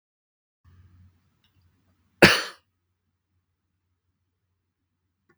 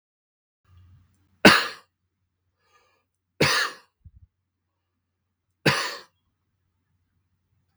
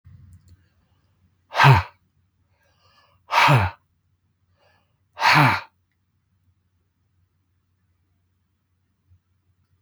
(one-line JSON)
{"cough_length": "5.4 s", "cough_amplitude": 32768, "cough_signal_mean_std_ratio": 0.14, "three_cough_length": "7.8 s", "three_cough_amplitude": 32768, "three_cough_signal_mean_std_ratio": 0.21, "exhalation_length": "9.8 s", "exhalation_amplitude": 32768, "exhalation_signal_mean_std_ratio": 0.26, "survey_phase": "beta (2021-08-13 to 2022-03-07)", "age": "65+", "gender": "Male", "wearing_mask": "No", "symptom_none": true, "smoker_status": "Never smoked", "respiratory_condition_asthma": false, "respiratory_condition_other": false, "recruitment_source": "REACT", "submission_delay": "1 day", "covid_test_result": "Negative", "covid_test_method": "RT-qPCR"}